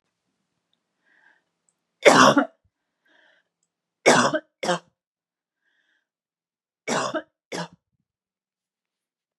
three_cough_length: 9.4 s
three_cough_amplitude: 32768
three_cough_signal_mean_std_ratio: 0.25
survey_phase: beta (2021-08-13 to 2022-03-07)
age: 18-44
gender: Female
wearing_mask: 'No'
symptom_none: true
smoker_status: Never smoked
respiratory_condition_asthma: false
respiratory_condition_other: false
recruitment_source: REACT
submission_delay: 3 days
covid_test_result: Negative
covid_test_method: RT-qPCR
influenza_a_test_result: Negative
influenza_b_test_result: Negative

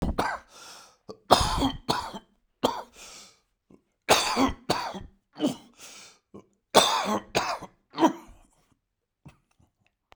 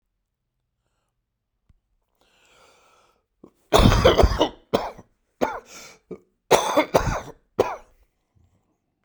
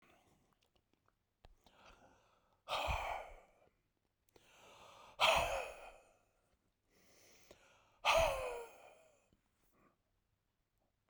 three_cough_length: 10.2 s
three_cough_amplitude: 32767
three_cough_signal_mean_std_ratio: 0.39
cough_length: 9.0 s
cough_amplitude: 32619
cough_signal_mean_std_ratio: 0.32
exhalation_length: 11.1 s
exhalation_amplitude: 4145
exhalation_signal_mean_std_ratio: 0.31
survey_phase: beta (2021-08-13 to 2022-03-07)
age: 65+
gender: Male
wearing_mask: 'No'
symptom_cough_any: true
symptom_shortness_of_breath: true
symptom_fatigue: true
symptom_fever_high_temperature: true
symptom_headache: true
symptom_onset: 6 days
smoker_status: Never smoked
respiratory_condition_asthma: false
respiratory_condition_other: false
recruitment_source: Test and Trace
submission_delay: 2 days
covid_test_result: Positive
covid_test_method: RT-qPCR
covid_ct_value: 16.9
covid_ct_gene: ORF1ab gene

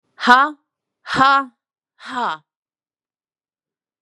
exhalation_length: 4.0 s
exhalation_amplitude: 32768
exhalation_signal_mean_std_ratio: 0.32
survey_phase: beta (2021-08-13 to 2022-03-07)
age: 18-44
gender: Female
wearing_mask: 'No'
symptom_cough_any: true
symptom_runny_or_blocked_nose: true
symptom_fatigue: true
symptom_other: true
symptom_onset: 4 days
smoker_status: Ex-smoker
respiratory_condition_asthma: false
respiratory_condition_other: false
recruitment_source: Test and Trace
submission_delay: 2 days
covid_test_result: Positive
covid_test_method: RT-qPCR
covid_ct_value: 19.6
covid_ct_gene: N gene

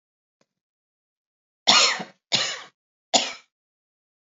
three_cough_length: 4.3 s
three_cough_amplitude: 32609
three_cough_signal_mean_std_ratio: 0.29
survey_phase: beta (2021-08-13 to 2022-03-07)
age: 45-64
gender: Female
wearing_mask: 'No'
symptom_none: true
smoker_status: Never smoked
respiratory_condition_asthma: false
respiratory_condition_other: false
recruitment_source: REACT
submission_delay: 1 day
covid_test_result: Negative
covid_test_method: RT-qPCR
influenza_a_test_result: Negative
influenza_b_test_result: Negative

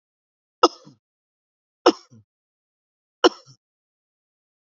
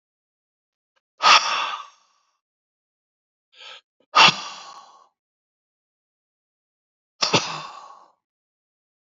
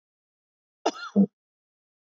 three_cough_length: 4.7 s
three_cough_amplitude: 31424
three_cough_signal_mean_std_ratio: 0.14
exhalation_length: 9.1 s
exhalation_amplitude: 31660
exhalation_signal_mean_std_ratio: 0.24
cough_length: 2.1 s
cough_amplitude: 10330
cough_signal_mean_std_ratio: 0.23
survey_phase: beta (2021-08-13 to 2022-03-07)
age: 65+
gender: Male
wearing_mask: 'No'
symptom_none: true
smoker_status: Ex-smoker
respiratory_condition_asthma: false
respiratory_condition_other: false
recruitment_source: REACT
submission_delay: 2 days
covid_test_result: Negative
covid_test_method: RT-qPCR
influenza_a_test_result: Negative
influenza_b_test_result: Negative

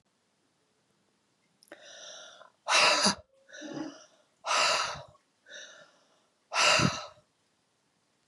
exhalation_length: 8.3 s
exhalation_amplitude: 11606
exhalation_signal_mean_std_ratio: 0.37
survey_phase: beta (2021-08-13 to 2022-03-07)
age: 45-64
gender: Female
wearing_mask: 'No'
symptom_none: true
symptom_onset: 11 days
smoker_status: Never smoked
respiratory_condition_asthma: false
respiratory_condition_other: false
recruitment_source: REACT
submission_delay: 1 day
covid_test_result: Negative
covid_test_method: RT-qPCR
influenza_a_test_result: Negative
influenza_b_test_result: Negative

